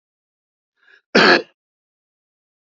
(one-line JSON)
{"cough_length": "2.7 s", "cough_amplitude": 28505, "cough_signal_mean_std_ratio": 0.25, "survey_phase": "beta (2021-08-13 to 2022-03-07)", "age": "45-64", "gender": "Male", "wearing_mask": "No", "symptom_none": true, "smoker_status": "Never smoked", "respiratory_condition_asthma": true, "respiratory_condition_other": false, "recruitment_source": "REACT", "submission_delay": "3 days", "covid_test_result": "Negative", "covid_test_method": "RT-qPCR", "influenza_a_test_result": "Negative", "influenza_b_test_result": "Negative"}